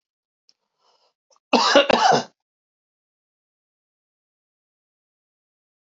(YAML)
cough_length: 5.8 s
cough_amplitude: 32371
cough_signal_mean_std_ratio: 0.25
survey_phase: beta (2021-08-13 to 2022-03-07)
age: 65+
gender: Male
wearing_mask: 'No'
symptom_none: true
smoker_status: Never smoked
respiratory_condition_asthma: false
respiratory_condition_other: false
recruitment_source: REACT
submission_delay: 3 days
covid_test_result: Negative
covid_test_method: RT-qPCR
influenza_a_test_result: Negative
influenza_b_test_result: Negative